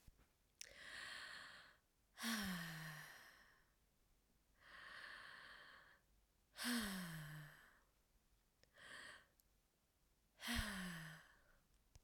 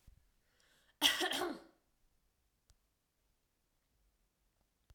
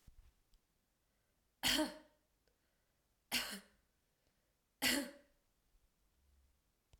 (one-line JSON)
{"exhalation_length": "12.0 s", "exhalation_amplitude": 829, "exhalation_signal_mean_std_ratio": 0.51, "cough_length": "4.9 s", "cough_amplitude": 7965, "cough_signal_mean_std_ratio": 0.25, "three_cough_length": "7.0 s", "three_cough_amplitude": 2671, "three_cough_signal_mean_std_ratio": 0.27, "survey_phase": "alpha (2021-03-01 to 2021-08-12)", "age": "18-44", "gender": "Female", "wearing_mask": "No", "symptom_fatigue": true, "symptom_onset": "3 days", "smoker_status": "Never smoked", "respiratory_condition_asthma": false, "respiratory_condition_other": false, "recruitment_source": "Test and Trace", "submission_delay": "1 day", "covid_test_result": "Positive", "covid_test_method": "ePCR"}